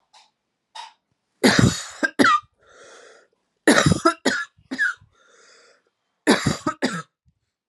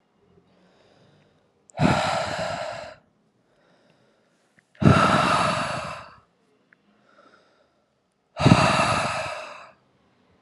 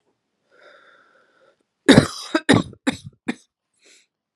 {
  "three_cough_length": "7.7 s",
  "three_cough_amplitude": 32662,
  "three_cough_signal_mean_std_ratio": 0.38,
  "exhalation_length": "10.4 s",
  "exhalation_amplitude": 31429,
  "exhalation_signal_mean_std_ratio": 0.41,
  "cough_length": "4.4 s",
  "cough_amplitude": 32768,
  "cough_signal_mean_std_ratio": 0.24,
  "survey_phase": "alpha (2021-03-01 to 2021-08-12)",
  "age": "18-44",
  "gender": "Female",
  "wearing_mask": "No",
  "symptom_fatigue": true,
  "symptom_headache": true,
  "symptom_change_to_sense_of_smell_or_taste": true,
  "symptom_loss_of_taste": true,
  "symptom_onset": "2 days",
  "smoker_status": "Ex-smoker",
  "respiratory_condition_asthma": false,
  "respiratory_condition_other": false,
  "recruitment_source": "Test and Trace",
  "submission_delay": "1 day",
  "covid_ct_value": 23.8,
  "covid_ct_gene": "ORF1ab gene"
}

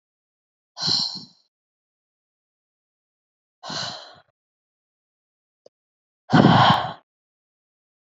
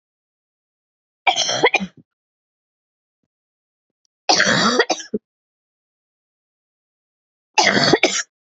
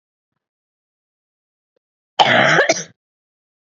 {
  "exhalation_length": "8.1 s",
  "exhalation_amplitude": 27254,
  "exhalation_signal_mean_std_ratio": 0.26,
  "three_cough_length": "8.5 s",
  "three_cough_amplitude": 31357,
  "three_cough_signal_mean_std_ratio": 0.34,
  "cough_length": "3.8 s",
  "cough_amplitude": 30564,
  "cough_signal_mean_std_ratio": 0.31,
  "survey_phase": "beta (2021-08-13 to 2022-03-07)",
  "age": "18-44",
  "gender": "Female",
  "wearing_mask": "No",
  "symptom_cough_any": true,
  "symptom_runny_or_blocked_nose": true,
  "symptom_shortness_of_breath": true,
  "symptom_sore_throat": true,
  "symptom_fatigue": true,
  "symptom_headache": true,
  "symptom_onset": "6 days",
  "smoker_status": "Never smoked",
  "respiratory_condition_asthma": false,
  "respiratory_condition_other": false,
  "recruitment_source": "Test and Trace",
  "submission_delay": "2 days",
  "covid_test_result": "Positive",
  "covid_test_method": "RT-qPCR",
  "covid_ct_value": 28.6,
  "covid_ct_gene": "ORF1ab gene",
  "covid_ct_mean": 28.8,
  "covid_viral_load": "370 copies/ml",
  "covid_viral_load_category": "Minimal viral load (< 10K copies/ml)"
}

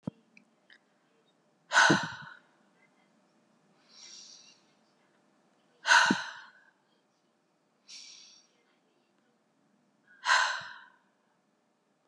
{
  "exhalation_length": "12.1 s",
  "exhalation_amplitude": 11258,
  "exhalation_signal_mean_std_ratio": 0.25,
  "survey_phase": "beta (2021-08-13 to 2022-03-07)",
  "age": "18-44",
  "gender": "Female",
  "wearing_mask": "No",
  "symptom_none": true,
  "smoker_status": "Never smoked",
  "respiratory_condition_asthma": false,
  "respiratory_condition_other": false,
  "recruitment_source": "REACT",
  "submission_delay": "1 day",
  "covid_test_result": "Negative",
  "covid_test_method": "RT-qPCR",
  "influenza_a_test_result": "Negative",
  "influenza_b_test_result": "Negative"
}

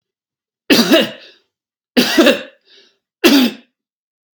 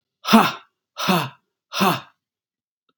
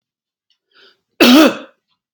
{
  "three_cough_length": "4.4 s",
  "three_cough_amplitude": 32768,
  "three_cough_signal_mean_std_ratio": 0.41,
  "exhalation_length": "3.0 s",
  "exhalation_amplitude": 32767,
  "exhalation_signal_mean_std_ratio": 0.36,
  "cough_length": "2.1 s",
  "cough_amplitude": 32768,
  "cough_signal_mean_std_ratio": 0.35,
  "survey_phase": "beta (2021-08-13 to 2022-03-07)",
  "age": "45-64",
  "gender": "Male",
  "wearing_mask": "No",
  "symptom_none": true,
  "smoker_status": "Never smoked",
  "respiratory_condition_asthma": false,
  "respiratory_condition_other": false,
  "recruitment_source": "REACT",
  "submission_delay": "2 days",
  "covid_test_result": "Negative",
  "covid_test_method": "RT-qPCR",
  "influenza_a_test_result": "Negative",
  "influenza_b_test_result": "Negative"
}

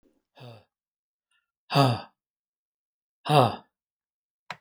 {
  "exhalation_length": "4.6 s",
  "exhalation_amplitude": 20962,
  "exhalation_signal_mean_std_ratio": 0.25,
  "survey_phase": "alpha (2021-03-01 to 2021-08-12)",
  "age": "65+",
  "gender": "Male",
  "wearing_mask": "No",
  "symptom_none": true,
  "smoker_status": "Never smoked",
  "respiratory_condition_asthma": true,
  "respiratory_condition_other": false,
  "recruitment_source": "Test and Trace",
  "submission_delay": "0 days",
  "covid_test_result": "Negative",
  "covid_test_method": "LFT"
}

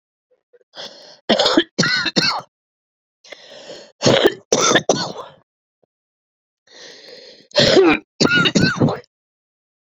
{
  "three_cough_length": "10.0 s",
  "three_cough_amplitude": 32768,
  "three_cough_signal_mean_std_ratio": 0.44,
  "survey_phase": "beta (2021-08-13 to 2022-03-07)",
  "age": "45-64",
  "gender": "Female",
  "wearing_mask": "No",
  "symptom_cough_any": true,
  "symptom_runny_or_blocked_nose": true,
  "symptom_abdominal_pain": true,
  "symptom_diarrhoea": true,
  "symptom_fatigue": true,
  "symptom_change_to_sense_of_smell_or_taste": true,
  "symptom_loss_of_taste": true,
  "symptom_other": true,
  "symptom_onset": "5 days",
  "smoker_status": "Never smoked",
  "respiratory_condition_asthma": true,
  "respiratory_condition_other": false,
  "recruitment_source": "Test and Trace",
  "submission_delay": "2 days",
  "covid_test_result": "Positive",
  "covid_test_method": "RT-qPCR"
}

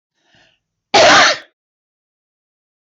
{
  "three_cough_length": "2.9 s",
  "three_cough_amplitude": 26577,
  "three_cough_signal_mean_std_ratio": 0.35,
  "survey_phase": "beta (2021-08-13 to 2022-03-07)",
  "age": "65+",
  "gender": "Female",
  "wearing_mask": "No",
  "symptom_none": true,
  "smoker_status": "Ex-smoker",
  "respiratory_condition_asthma": false,
  "respiratory_condition_other": false,
  "recruitment_source": "REACT",
  "submission_delay": "2 days",
  "covid_test_result": "Negative",
  "covid_test_method": "RT-qPCR",
  "influenza_a_test_result": "Negative",
  "influenza_b_test_result": "Negative"
}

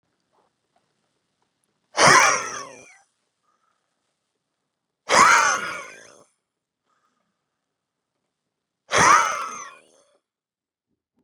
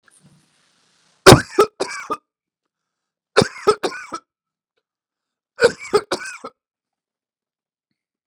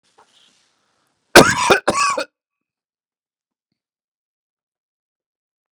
{
  "exhalation_length": "11.2 s",
  "exhalation_amplitude": 29574,
  "exhalation_signal_mean_std_ratio": 0.29,
  "three_cough_length": "8.3 s",
  "three_cough_amplitude": 32768,
  "three_cough_signal_mean_std_ratio": 0.22,
  "cough_length": "5.8 s",
  "cough_amplitude": 32768,
  "cough_signal_mean_std_ratio": 0.23,
  "survey_phase": "beta (2021-08-13 to 2022-03-07)",
  "age": "45-64",
  "gender": "Male",
  "wearing_mask": "No",
  "symptom_none": true,
  "smoker_status": "Ex-smoker",
  "respiratory_condition_asthma": false,
  "respiratory_condition_other": false,
  "recruitment_source": "Test and Trace",
  "submission_delay": "1 day",
  "covid_test_result": "Positive",
  "covid_test_method": "ePCR"
}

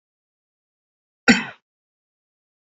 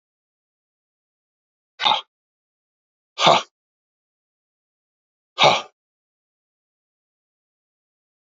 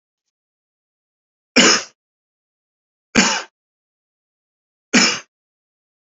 {
  "cough_length": "2.7 s",
  "cough_amplitude": 27701,
  "cough_signal_mean_std_ratio": 0.16,
  "exhalation_length": "8.3 s",
  "exhalation_amplitude": 29864,
  "exhalation_signal_mean_std_ratio": 0.2,
  "three_cough_length": "6.1 s",
  "three_cough_amplitude": 32768,
  "three_cough_signal_mean_std_ratio": 0.26,
  "survey_phase": "beta (2021-08-13 to 2022-03-07)",
  "age": "45-64",
  "gender": "Male",
  "wearing_mask": "No",
  "symptom_sore_throat": true,
  "symptom_onset": "3 days",
  "smoker_status": "Never smoked",
  "respiratory_condition_asthma": false,
  "respiratory_condition_other": false,
  "recruitment_source": "Test and Trace",
  "submission_delay": "1 day",
  "covid_test_result": "Positive",
  "covid_test_method": "RT-qPCR",
  "covid_ct_value": 27.3,
  "covid_ct_gene": "ORF1ab gene",
  "covid_ct_mean": 27.5,
  "covid_viral_load": "950 copies/ml",
  "covid_viral_load_category": "Minimal viral load (< 10K copies/ml)"
}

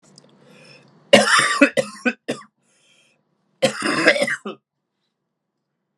{
  "three_cough_length": "6.0 s",
  "three_cough_amplitude": 32768,
  "three_cough_signal_mean_std_ratio": 0.36,
  "survey_phase": "alpha (2021-03-01 to 2021-08-12)",
  "age": "18-44",
  "gender": "Male",
  "wearing_mask": "No",
  "symptom_cough_any": true,
  "symptom_diarrhoea": true,
  "symptom_fatigue": true,
  "symptom_fever_high_temperature": true,
  "symptom_headache": true,
  "symptom_change_to_sense_of_smell_or_taste": true,
  "symptom_loss_of_taste": true,
  "symptom_onset": "3 days",
  "smoker_status": "Never smoked",
  "respiratory_condition_asthma": false,
  "respiratory_condition_other": false,
  "recruitment_source": "Test and Trace",
  "submission_delay": "3 days",
  "covid_test_result": "Positive",
  "covid_test_method": "RT-qPCR",
  "covid_ct_value": 18.0,
  "covid_ct_gene": "ORF1ab gene",
  "covid_ct_mean": 19.2,
  "covid_viral_load": "490000 copies/ml",
  "covid_viral_load_category": "Low viral load (10K-1M copies/ml)"
}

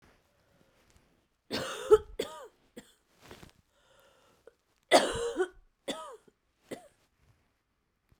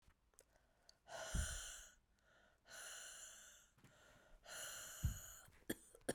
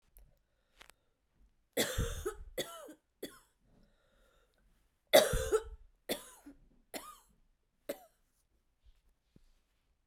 {
  "three_cough_length": "8.2 s",
  "three_cough_amplitude": 13611,
  "three_cough_signal_mean_std_ratio": 0.24,
  "exhalation_length": "6.1 s",
  "exhalation_amplitude": 1256,
  "exhalation_signal_mean_std_ratio": 0.47,
  "cough_length": "10.1 s",
  "cough_amplitude": 11244,
  "cough_signal_mean_std_ratio": 0.25,
  "survey_phase": "beta (2021-08-13 to 2022-03-07)",
  "age": "45-64",
  "gender": "Female",
  "wearing_mask": "No",
  "symptom_cough_any": true,
  "symptom_runny_or_blocked_nose": true,
  "symptom_shortness_of_breath": true,
  "symptom_fatigue": true,
  "symptom_fever_high_temperature": true,
  "symptom_headache": true,
  "symptom_change_to_sense_of_smell_or_taste": true,
  "symptom_loss_of_taste": true,
  "symptom_onset": "2 days",
  "smoker_status": "Never smoked",
  "respiratory_condition_asthma": true,
  "respiratory_condition_other": false,
  "recruitment_source": "Test and Trace",
  "submission_delay": "1 day",
  "covid_test_result": "Positive",
  "covid_test_method": "RT-qPCR"
}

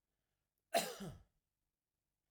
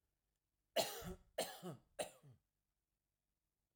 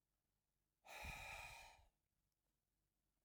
{
  "cough_length": "2.3 s",
  "cough_amplitude": 2497,
  "cough_signal_mean_std_ratio": 0.26,
  "three_cough_length": "3.8 s",
  "three_cough_amplitude": 2255,
  "three_cough_signal_mean_std_ratio": 0.32,
  "exhalation_length": "3.2 s",
  "exhalation_amplitude": 323,
  "exhalation_signal_mean_std_ratio": 0.45,
  "survey_phase": "alpha (2021-03-01 to 2021-08-12)",
  "age": "45-64",
  "gender": "Male",
  "wearing_mask": "No",
  "symptom_none": true,
  "smoker_status": "Never smoked",
  "respiratory_condition_asthma": false,
  "respiratory_condition_other": false,
  "recruitment_source": "REACT",
  "submission_delay": "1 day",
  "covid_test_result": "Negative",
  "covid_test_method": "RT-qPCR"
}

